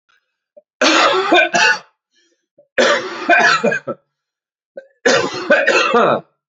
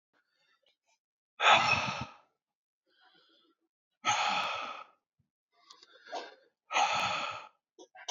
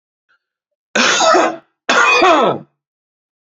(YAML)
three_cough_length: 6.5 s
three_cough_amplitude: 31309
three_cough_signal_mean_std_ratio: 0.58
exhalation_length: 8.1 s
exhalation_amplitude: 11712
exhalation_signal_mean_std_ratio: 0.38
cough_length: 3.6 s
cough_amplitude: 30255
cough_signal_mean_std_ratio: 0.52
survey_phase: beta (2021-08-13 to 2022-03-07)
age: 18-44
gender: Male
wearing_mask: 'No'
symptom_runny_or_blocked_nose: true
symptom_fatigue: true
symptom_onset: 9 days
smoker_status: Ex-smoker
respiratory_condition_asthma: false
respiratory_condition_other: false
recruitment_source: Test and Trace
submission_delay: 2 days
covid_test_result: Positive
covid_test_method: RT-qPCR
covid_ct_value: 25.9
covid_ct_gene: ORF1ab gene